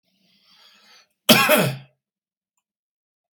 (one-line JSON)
{"cough_length": "3.3 s", "cough_amplitude": 32768, "cough_signal_mean_std_ratio": 0.28, "survey_phase": "beta (2021-08-13 to 2022-03-07)", "age": "65+", "gender": "Male", "wearing_mask": "No", "symptom_cough_any": true, "smoker_status": "Never smoked", "respiratory_condition_asthma": false, "respiratory_condition_other": false, "recruitment_source": "REACT", "submission_delay": "11 days", "covid_test_result": "Negative", "covid_test_method": "RT-qPCR", "influenza_a_test_result": "Negative", "influenza_b_test_result": "Negative"}